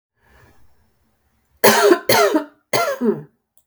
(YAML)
three_cough_length: 3.7 s
three_cough_amplitude: 32768
three_cough_signal_mean_std_ratio: 0.44
survey_phase: beta (2021-08-13 to 2022-03-07)
age: 45-64
gender: Female
wearing_mask: 'No'
symptom_headache: true
symptom_onset: 5 days
smoker_status: Ex-smoker
respiratory_condition_asthma: false
respiratory_condition_other: false
recruitment_source: REACT
submission_delay: 2 days
covid_test_result: Negative
covid_test_method: RT-qPCR
influenza_a_test_result: Negative
influenza_b_test_result: Negative